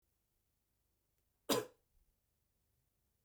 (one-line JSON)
{"cough_length": "3.2 s", "cough_amplitude": 3053, "cough_signal_mean_std_ratio": 0.18, "survey_phase": "beta (2021-08-13 to 2022-03-07)", "age": "18-44", "gender": "Male", "wearing_mask": "No", "symptom_none": true, "smoker_status": "Never smoked", "respiratory_condition_asthma": false, "respiratory_condition_other": false, "recruitment_source": "REACT", "submission_delay": "0 days", "covid_test_result": "Negative", "covid_test_method": "RT-qPCR"}